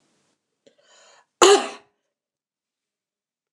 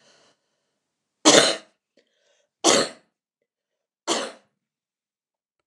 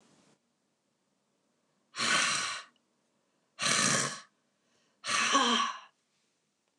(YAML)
cough_length: 3.5 s
cough_amplitude: 29204
cough_signal_mean_std_ratio: 0.2
three_cough_length: 5.7 s
three_cough_amplitude: 29203
three_cough_signal_mean_std_ratio: 0.26
exhalation_length: 6.8 s
exhalation_amplitude: 9693
exhalation_signal_mean_std_ratio: 0.44
survey_phase: beta (2021-08-13 to 2022-03-07)
age: 45-64
gender: Female
wearing_mask: 'No'
symptom_none: true
symptom_onset: 7 days
smoker_status: Never smoked
respiratory_condition_asthma: false
respiratory_condition_other: false
recruitment_source: REACT
submission_delay: 5 days
covid_test_result: Negative
covid_test_method: RT-qPCR